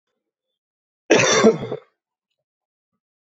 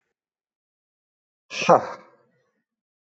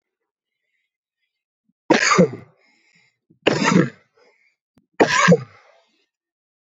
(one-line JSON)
{"cough_length": "3.2 s", "cough_amplitude": 26870, "cough_signal_mean_std_ratio": 0.32, "exhalation_length": "3.2 s", "exhalation_amplitude": 23848, "exhalation_signal_mean_std_ratio": 0.2, "three_cough_length": "6.7 s", "three_cough_amplitude": 26291, "three_cough_signal_mean_std_ratio": 0.32, "survey_phase": "beta (2021-08-13 to 2022-03-07)", "age": "18-44", "gender": "Male", "wearing_mask": "No", "symptom_none": true, "smoker_status": "Current smoker (11 or more cigarettes per day)", "respiratory_condition_asthma": false, "respiratory_condition_other": false, "recruitment_source": "REACT", "submission_delay": "1 day", "covid_test_result": "Negative", "covid_test_method": "RT-qPCR", "influenza_a_test_result": "Negative", "influenza_b_test_result": "Negative"}